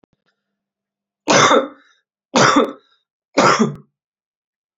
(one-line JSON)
{"three_cough_length": "4.8 s", "three_cough_amplitude": 32767, "three_cough_signal_mean_std_ratio": 0.38, "survey_phase": "beta (2021-08-13 to 2022-03-07)", "age": "18-44", "gender": "Male", "wearing_mask": "No", "symptom_cough_any": true, "symptom_sore_throat": true, "symptom_headache": true, "symptom_onset": "5 days", "smoker_status": "Never smoked", "respiratory_condition_asthma": false, "respiratory_condition_other": false, "recruitment_source": "Test and Trace", "submission_delay": "2 days", "covid_test_result": "Positive", "covid_test_method": "RT-qPCR", "covid_ct_value": 20.5, "covid_ct_gene": "N gene"}